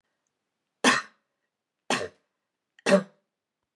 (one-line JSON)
{"three_cough_length": "3.8 s", "three_cough_amplitude": 14835, "three_cough_signal_mean_std_ratio": 0.26, "survey_phase": "beta (2021-08-13 to 2022-03-07)", "age": "65+", "gender": "Female", "wearing_mask": "No", "symptom_none": true, "symptom_onset": "3 days", "smoker_status": "Never smoked", "respiratory_condition_asthma": false, "respiratory_condition_other": false, "recruitment_source": "REACT", "submission_delay": "3 days", "covid_test_result": "Negative", "covid_test_method": "RT-qPCR", "influenza_a_test_result": "Negative", "influenza_b_test_result": "Negative"}